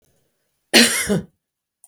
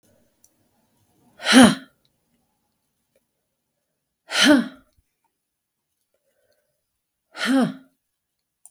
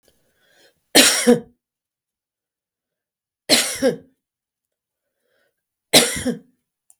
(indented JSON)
{
  "cough_length": "1.9 s",
  "cough_amplitude": 32768,
  "cough_signal_mean_std_ratio": 0.36,
  "exhalation_length": "8.7 s",
  "exhalation_amplitude": 32548,
  "exhalation_signal_mean_std_ratio": 0.25,
  "three_cough_length": "7.0 s",
  "three_cough_amplitude": 32768,
  "three_cough_signal_mean_std_ratio": 0.29,
  "survey_phase": "beta (2021-08-13 to 2022-03-07)",
  "age": "45-64",
  "gender": "Female",
  "wearing_mask": "No",
  "symptom_none": true,
  "smoker_status": "Never smoked",
  "respiratory_condition_asthma": false,
  "respiratory_condition_other": false,
  "recruitment_source": "REACT",
  "submission_delay": "2 days",
  "covid_test_result": "Negative",
  "covid_test_method": "RT-qPCR",
  "influenza_a_test_result": "Negative",
  "influenza_b_test_result": "Negative"
}